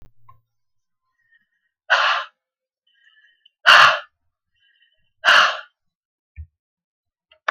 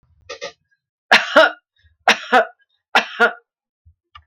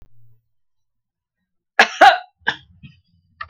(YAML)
exhalation_length: 7.5 s
exhalation_amplitude: 32768
exhalation_signal_mean_std_ratio: 0.27
three_cough_length: 4.3 s
three_cough_amplitude: 32766
three_cough_signal_mean_std_ratio: 0.33
cough_length: 3.5 s
cough_amplitude: 32768
cough_signal_mean_std_ratio: 0.23
survey_phase: beta (2021-08-13 to 2022-03-07)
age: 65+
gender: Female
wearing_mask: 'No'
symptom_none: true
smoker_status: Never smoked
respiratory_condition_asthma: false
respiratory_condition_other: false
recruitment_source: REACT
submission_delay: 3 days
covid_test_result: Negative
covid_test_method: RT-qPCR